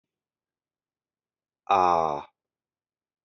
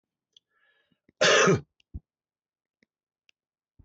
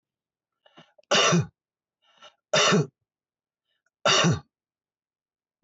{
  "exhalation_length": "3.2 s",
  "exhalation_amplitude": 12446,
  "exhalation_signal_mean_std_ratio": 0.27,
  "cough_length": "3.8 s",
  "cough_amplitude": 14508,
  "cough_signal_mean_std_ratio": 0.26,
  "three_cough_length": "5.6 s",
  "three_cough_amplitude": 12740,
  "three_cough_signal_mean_std_ratio": 0.35,
  "survey_phase": "beta (2021-08-13 to 2022-03-07)",
  "age": "45-64",
  "gender": "Male",
  "wearing_mask": "No",
  "symptom_none": true,
  "symptom_onset": "12 days",
  "smoker_status": "Current smoker (11 or more cigarettes per day)",
  "respiratory_condition_asthma": false,
  "respiratory_condition_other": false,
  "recruitment_source": "REACT",
  "submission_delay": "5 days",
  "covid_test_result": "Negative",
  "covid_test_method": "RT-qPCR"
}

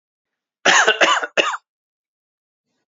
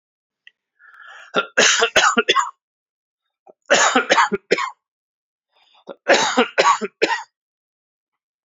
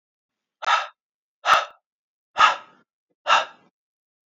{
  "cough_length": "3.0 s",
  "cough_amplitude": 32767,
  "cough_signal_mean_std_ratio": 0.38,
  "three_cough_length": "8.4 s",
  "three_cough_amplitude": 30890,
  "three_cough_signal_mean_std_ratio": 0.42,
  "exhalation_length": "4.3 s",
  "exhalation_amplitude": 25983,
  "exhalation_signal_mean_std_ratio": 0.32,
  "survey_phase": "beta (2021-08-13 to 2022-03-07)",
  "age": "45-64",
  "gender": "Male",
  "wearing_mask": "No",
  "symptom_cough_any": true,
  "symptom_shortness_of_breath": true,
  "symptom_fatigue": true,
  "symptom_headache": true,
  "symptom_onset": "7 days",
  "smoker_status": "Never smoked",
  "respiratory_condition_asthma": false,
  "respiratory_condition_other": false,
  "recruitment_source": "Test and Trace",
  "submission_delay": "2 days",
  "covid_test_result": "Positive",
  "covid_test_method": "RT-qPCR",
  "covid_ct_value": 16.2,
  "covid_ct_gene": "ORF1ab gene",
  "covid_ct_mean": 16.7,
  "covid_viral_load": "3400000 copies/ml",
  "covid_viral_load_category": "High viral load (>1M copies/ml)"
}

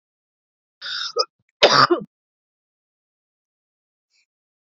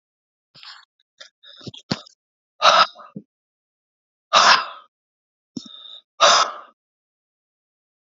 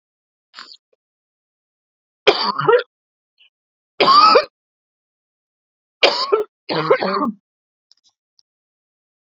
{
  "cough_length": "4.7 s",
  "cough_amplitude": 30048,
  "cough_signal_mean_std_ratio": 0.25,
  "exhalation_length": "8.1 s",
  "exhalation_amplitude": 32767,
  "exhalation_signal_mean_std_ratio": 0.27,
  "three_cough_length": "9.3 s",
  "three_cough_amplitude": 30429,
  "three_cough_signal_mean_std_ratio": 0.33,
  "survey_phase": "beta (2021-08-13 to 2022-03-07)",
  "age": "65+",
  "gender": "Female",
  "wearing_mask": "No",
  "symptom_cough_any": true,
  "symptom_onset": "13 days",
  "smoker_status": "Never smoked",
  "respiratory_condition_asthma": false,
  "respiratory_condition_other": false,
  "recruitment_source": "REACT",
  "submission_delay": "2 days",
  "covid_test_result": "Negative",
  "covid_test_method": "RT-qPCR"
}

